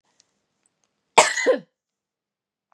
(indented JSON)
{
  "cough_length": "2.7 s",
  "cough_amplitude": 32767,
  "cough_signal_mean_std_ratio": 0.25,
  "survey_phase": "beta (2021-08-13 to 2022-03-07)",
  "age": "45-64",
  "gender": "Female",
  "wearing_mask": "No",
  "symptom_cough_any": true,
  "symptom_runny_or_blocked_nose": true,
  "symptom_fatigue": true,
  "symptom_headache": true,
  "smoker_status": "Ex-smoker",
  "respiratory_condition_asthma": false,
  "respiratory_condition_other": false,
  "recruitment_source": "Test and Trace",
  "submission_delay": "2 days",
  "covid_test_result": "Positive",
  "covid_test_method": "LFT"
}